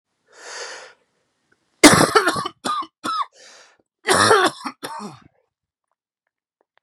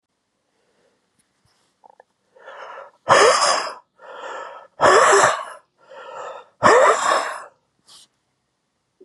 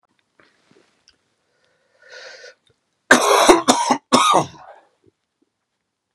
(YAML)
cough_length: 6.8 s
cough_amplitude: 32768
cough_signal_mean_std_ratio: 0.34
exhalation_length: 9.0 s
exhalation_amplitude: 32454
exhalation_signal_mean_std_ratio: 0.4
three_cough_length: 6.1 s
three_cough_amplitude: 32768
three_cough_signal_mean_std_ratio: 0.33
survey_phase: beta (2021-08-13 to 2022-03-07)
age: 45-64
gender: Male
wearing_mask: 'No'
symptom_cough_any: true
symptom_runny_or_blocked_nose: true
symptom_shortness_of_breath: true
symptom_sore_throat: true
symptom_fatigue: true
symptom_headache: true
symptom_onset: 3 days
smoker_status: Ex-smoker
respiratory_condition_asthma: false
respiratory_condition_other: false
recruitment_source: Test and Trace
submission_delay: 2 days
covid_test_result: Positive
covid_test_method: RT-qPCR
covid_ct_value: 14.7
covid_ct_gene: ORF1ab gene
covid_ct_mean: 15.0
covid_viral_load: 12000000 copies/ml
covid_viral_load_category: High viral load (>1M copies/ml)